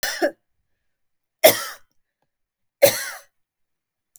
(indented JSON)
{
  "three_cough_length": "4.2 s",
  "three_cough_amplitude": 27136,
  "three_cough_signal_mean_std_ratio": 0.25,
  "survey_phase": "beta (2021-08-13 to 2022-03-07)",
  "age": "45-64",
  "gender": "Female",
  "wearing_mask": "No",
  "symptom_none": true,
  "smoker_status": "Never smoked",
  "respiratory_condition_asthma": true,
  "respiratory_condition_other": false,
  "recruitment_source": "REACT",
  "submission_delay": "2 days",
  "covid_test_result": "Negative",
  "covid_test_method": "RT-qPCR",
  "influenza_a_test_result": "Unknown/Void",
  "influenza_b_test_result": "Unknown/Void"
}